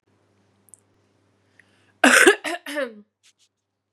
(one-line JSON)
{"cough_length": "3.9 s", "cough_amplitude": 32767, "cough_signal_mean_std_ratio": 0.27, "survey_phase": "beta (2021-08-13 to 2022-03-07)", "age": "18-44", "gender": "Female", "wearing_mask": "No", "symptom_cough_any": true, "symptom_new_continuous_cough": true, "symptom_runny_or_blocked_nose": true, "symptom_sore_throat": true, "symptom_fatigue": true, "symptom_headache": true, "symptom_loss_of_taste": true, "symptom_onset": "3 days", "smoker_status": "Never smoked", "respiratory_condition_asthma": false, "respiratory_condition_other": false, "recruitment_source": "Test and Trace", "submission_delay": "1 day", "covid_test_result": "Negative", "covid_test_method": "RT-qPCR"}